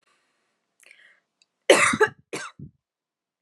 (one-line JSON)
{"cough_length": "3.4 s", "cough_amplitude": 28342, "cough_signal_mean_std_ratio": 0.26, "survey_phase": "alpha (2021-03-01 to 2021-08-12)", "age": "18-44", "gender": "Female", "wearing_mask": "No", "symptom_none": true, "symptom_onset": "13 days", "smoker_status": "Never smoked", "respiratory_condition_asthma": false, "respiratory_condition_other": false, "recruitment_source": "REACT", "submission_delay": "2 days", "covid_test_result": "Negative", "covid_test_method": "RT-qPCR"}